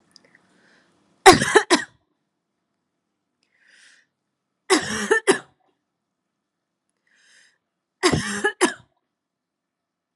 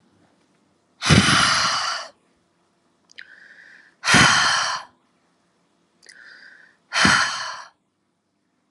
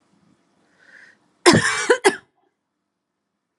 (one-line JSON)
{"three_cough_length": "10.2 s", "three_cough_amplitude": 32768, "three_cough_signal_mean_std_ratio": 0.25, "exhalation_length": "8.7 s", "exhalation_amplitude": 30617, "exhalation_signal_mean_std_ratio": 0.41, "cough_length": "3.6 s", "cough_amplitude": 32767, "cough_signal_mean_std_ratio": 0.29, "survey_phase": "alpha (2021-03-01 to 2021-08-12)", "age": "18-44", "gender": "Female", "wearing_mask": "No", "symptom_cough_any": true, "symptom_fatigue": true, "symptom_change_to_sense_of_smell_or_taste": true, "symptom_loss_of_taste": true, "symptom_onset": "3 days", "smoker_status": "Never smoked", "respiratory_condition_asthma": true, "respiratory_condition_other": false, "recruitment_source": "Test and Trace", "submission_delay": "2 days", "covid_test_result": "Positive", "covid_test_method": "RT-qPCR", "covid_ct_value": 12.5, "covid_ct_gene": "N gene", "covid_ct_mean": 13.0, "covid_viral_load": "54000000 copies/ml", "covid_viral_load_category": "High viral load (>1M copies/ml)"}